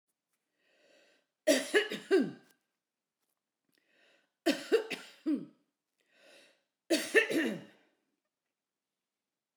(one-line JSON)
{"three_cough_length": "9.6 s", "three_cough_amplitude": 9075, "three_cough_signal_mean_std_ratio": 0.32, "survey_phase": "beta (2021-08-13 to 2022-03-07)", "age": "65+", "gender": "Female", "wearing_mask": "No", "symptom_none": true, "smoker_status": "Never smoked", "respiratory_condition_asthma": false, "respiratory_condition_other": false, "recruitment_source": "REACT", "submission_delay": "3 days", "covid_test_result": "Negative", "covid_test_method": "RT-qPCR"}